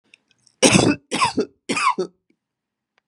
{
  "three_cough_length": "3.1 s",
  "three_cough_amplitude": 32768,
  "three_cough_signal_mean_std_ratio": 0.41,
  "survey_phase": "beta (2021-08-13 to 2022-03-07)",
  "age": "45-64",
  "gender": "Female",
  "wearing_mask": "No",
  "symptom_none": true,
  "smoker_status": "Ex-smoker",
  "respiratory_condition_asthma": false,
  "respiratory_condition_other": false,
  "recruitment_source": "REACT",
  "submission_delay": "1 day",
  "covid_test_result": "Negative",
  "covid_test_method": "RT-qPCR",
  "influenza_a_test_result": "Negative",
  "influenza_b_test_result": "Negative"
}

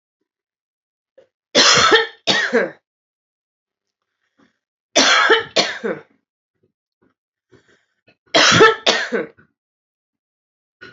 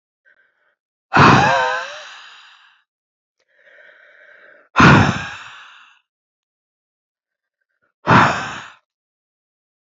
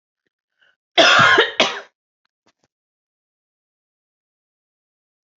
{
  "three_cough_length": "10.9 s",
  "three_cough_amplitude": 32768,
  "three_cough_signal_mean_std_ratio": 0.37,
  "exhalation_length": "10.0 s",
  "exhalation_amplitude": 28915,
  "exhalation_signal_mean_std_ratio": 0.31,
  "cough_length": "5.4 s",
  "cough_amplitude": 29803,
  "cough_signal_mean_std_ratio": 0.28,
  "survey_phase": "alpha (2021-03-01 to 2021-08-12)",
  "age": "45-64",
  "gender": "Female",
  "wearing_mask": "No",
  "symptom_cough_any": true,
  "symptom_change_to_sense_of_smell_or_taste": true,
  "symptom_loss_of_taste": true,
  "symptom_onset": "4 days",
  "smoker_status": "Never smoked",
  "respiratory_condition_asthma": true,
  "respiratory_condition_other": false,
  "recruitment_source": "Test and Trace",
  "submission_delay": "1 day",
  "covid_test_result": "Positive",
  "covid_test_method": "RT-qPCR",
  "covid_ct_value": 16.7,
  "covid_ct_gene": "N gene",
  "covid_ct_mean": 17.0,
  "covid_viral_load": "2700000 copies/ml",
  "covid_viral_load_category": "High viral load (>1M copies/ml)"
}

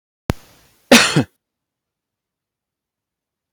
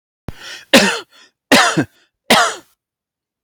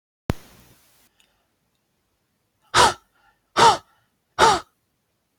{
  "cough_length": "3.5 s",
  "cough_amplitude": 32768,
  "cough_signal_mean_std_ratio": 0.22,
  "three_cough_length": "3.4 s",
  "three_cough_amplitude": 32768,
  "three_cough_signal_mean_std_ratio": 0.4,
  "exhalation_length": "5.4 s",
  "exhalation_amplitude": 29139,
  "exhalation_signal_mean_std_ratio": 0.27,
  "survey_phase": "beta (2021-08-13 to 2022-03-07)",
  "age": "45-64",
  "gender": "Male",
  "wearing_mask": "No",
  "symptom_none": true,
  "smoker_status": "Ex-smoker",
  "respiratory_condition_asthma": false,
  "respiratory_condition_other": false,
  "recruitment_source": "REACT",
  "submission_delay": "1 day",
  "covid_test_result": "Negative",
  "covid_test_method": "RT-qPCR",
  "influenza_a_test_result": "Negative",
  "influenza_b_test_result": "Negative"
}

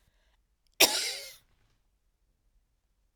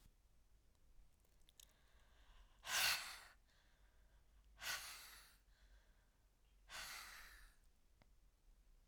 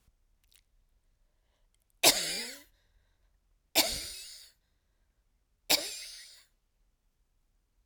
{
  "cough_length": "3.2 s",
  "cough_amplitude": 18524,
  "cough_signal_mean_std_ratio": 0.22,
  "exhalation_length": "8.9 s",
  "exhalation_amplitude": 1593,
  "exhalation_signal_mean_std_ratio": 0.36,
  "three_cough_length": "7.9 s",
  "three_cough_amplitude": 14026,
  "three_cough_signal_mean_std_ratio": 0.25,
  "survey_phase": "alpha (2021-03-01 to 2021-08-12)",
  "age": "45-64",
  "gender": "Female",
  "wearing_mask": "No",
  "symptom_shortness_of_breath": true,
  "symptom_fatigue": true,
  "symptom_onset": "11 days",
  "smoker_status": "Never smoked",
  "respiratory_condition_asthma": true,
  "respiratory_condition_other": false,
  "recruitment_source": "REACT",
  "submission_delay": "1 day",
  "covid_test_result": "Negative",
  "covid_test_method": "RT-qPCR"
}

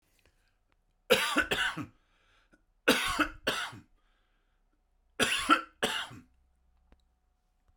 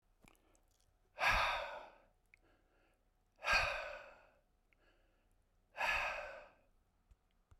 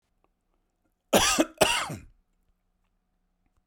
{
  "three_cough_length": "7.8 s",
  "three_cough_amplitude": 10725,
  "three_cough_signal_mean_std_ratio": 0.37,
  "exhalation_length": "7.6 s",
  "exhalation_amplitude": 3184,
  "exhalation_signal_mean_std_ratio": 0.38,
  "cough_length": "3.7 s",
  "cough_amplitude": 20920,
  "cough_signal_mean_std_ratio": 0.31,
  "survey_phase": "beta (2021-08-13 to 2022-03-07)",
  "age": "65+",
  "gender": "Male",
  "wearing_mask": "No",
  "symptom_cough_any": true,
  "smoker_status": "Never smoked",
  "respiratory_condition_asthma": false,
  "respiratory_condition_other": false,
  "recruitment_source": "REACT",
  "submission_delay": "2 days",
  "covid_test_result": "Negative",
  "covid_test_method": "RT-qPCR"
}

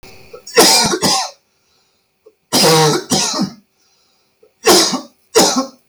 {
  "cough_length": "5.9 s",
  "cough_amplitude": 32768,
  "cough_signal_mean_std_ratio": 0.54,
  "survey_phase": "beta (2021-08-13 to 2022-03-07)",
  "age": "45-64",
  "gender": "Male",
  "wearing_mask": "No",
  "symptom_none": true,
  "smoker_status": "Never smoked",
  "respiratory_condition_asthma": false,
  "respiratory_condition_other": false,
  "recruitment_source": "REACT",
  "submission_delay": "3 days",
  "covid_test_result": "Negative",
  "covid_test_method": "RT-qPCR"
}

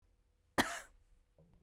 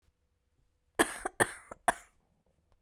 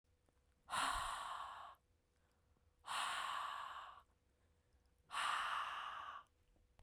{
  "cough_length": "1.6 s",
  "cough_amplitude": 5076,
  "cough_signal_mean_std_ratio": 0.25,
  "three_cough_length": "2.8 s",
  "three_cough_amplitude": 11127,
  "three_cough_signal_mean_std_ratio": 0.23,
  "exhalation_length": "6.8 s",
  "exhalation_amplitude": 1273,
  "exhalation_signal_mean_std_ratio": 0.59,
  "survey_phase": "beta (2021-08-13 to 2022-03-07)",
  "age": "18-44",
  "gender": "Female",
  "wearing_mask": "No",
  "symptom_none": true,
  "smoker_status": "Never smoked",
  "respiratory_condition_asthma": true,
  "respiratory_condition_other": false,
  "recruitment_source": "REACT",
  "submission_delay": "1 day",
  "covid_test_result": "Negative",
  "covid_test_method": "RT-qPCR"
}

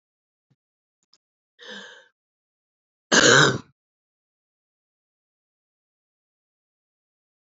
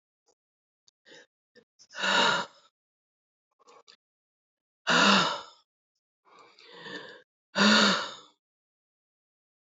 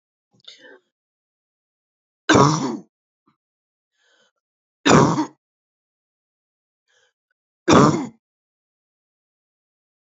{
  "cough_length": "7.5 s",
  "cough_amplitude": 28990,
  "cough_signal_mean_std_ratio": 0.19,
  "exhalation_length": "9.6 s",
  "exhalation_amplitude": 13033,
  "exhalation_signal_mean_std_ratio": 0.32,
  "three_cough_length": "10.2 s",
  "three_cough_amplitude": 27785,
  "three_cough_signal_mean_std_ratio": 0.26,
  "survey_phase": "beta (2021-08-13 to 2022-03-07)",
  "age": "45-64",
  "gender": "Female",
  "wearing_mask": "No",
  "symptom_cough_any": true,
  "symptom_new_continuous_cough": true,
  "symptom_shortness_of_breath": true,
  "symptom_sore_throat": true,
  "symptom_diarrhoea": true,
  "symptom_fatigue": true,
  "symptom_headache": true,
  "symptom_change_to_sense_of_smell_or_taste": true,
  "symptom_loss_of_taste": true,
  "symptom_other": true,
  "symptom_onset": "3 days",
  "smoker_status": "Never smoked",
  "respiratory_condition_asthma": false,
  "respiratory_condition_other": false,
  "recruitment_source": "Test and Trace",
  "submission_delay": "1 day",
  "covid_test_result": "Positive",
  "covid_test_method": "RT-qPCR",
  "covid_ct_value": 12.4,
  "covid_ct_gene": "S gene",
  "covid_ct_mean": 12.7,
  "covid_viral_load": "69000000 copies/ml",
  "covid_viral_load_category": "High viral load (>1M copies/ml)"
}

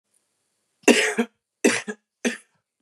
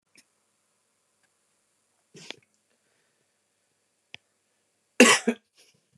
{
  "three_cough_length": "2.8 s",
  "three_cough_amplitude": 31504,
  "three_cough_signal_mean_std_ratio": 0.33,
  "cough_length": "6.0 s",
  "cough_amplitude": 25782,
  "cough_signal_mean_std_ratio": 0.15,
  "survey_phase": "beta (2021-08-13 to 2022-03-07)",
  "age": "18-44",
  "gender": "Male",
  "wearing_mask": "No",
  "symptom_cough_any": true,
  "symptom_runny_or_blocked_nose": true,
  "symptom_shortness_of_breath": true,
  "symptom_fatigue": true,
  "symptom_headache": true,
  "symptom_other": true,
  "symptom_onset": "3 days",
  "smoker_status": "Never smoked",
  "respiratory_condition_asthma": true,
  "respiratory_condition_other": false,
  "recruitment_source": "Test and Trace",
  "submission_delay": "1 day",
  "covid_test_result": "Positive",
  "covid_test_method": "RT-qPCR",
  "covid_ct_value": 17.1,
  "covid_ct_gene": "ORF1ab gene",
  "covid_ct_mean": 17.4,
  "covid_viral_load": "1900000 copies/ml",
  "covid_viral_load_category": "High viral load (>1M copies/ml)"
}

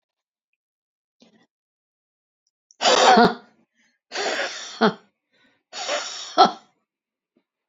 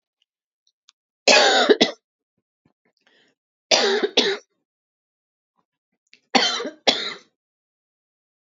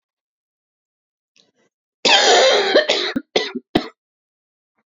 {
  "exhalation_length": "7.7 s",
  "exhalation_amplitude": 28915,
  "exhalation_signal_mean_std_ratio": 0.31,
  "three_cough_length": "8.4 s",
  "three_cough_amplitude": 30226,
  "three_cough_signal_mean_std_ratio": 0.33,
  "cough_length": "4.9 s",
  "cough_amplitude": 32767,
  "cough_signal_mean_std_ratio": 0.41,
  "survey_phase": "beta (2021-08-13 to 2022-03-07)",
  "age": "65+",
  "gender": "Female",
  "wearing_mask": "No",
  "symptom_none": true,
  "smoker_status": "Ex-smoker",
  "respiratory_condition_asthma": false,
  "respiratory_condition_other": false,
  "recruitment_source": "REACT",
  "submission_delay": "2 days",
  "covid_test_result": "Negative",
  "covid_test_method": "RT-qPCR"
}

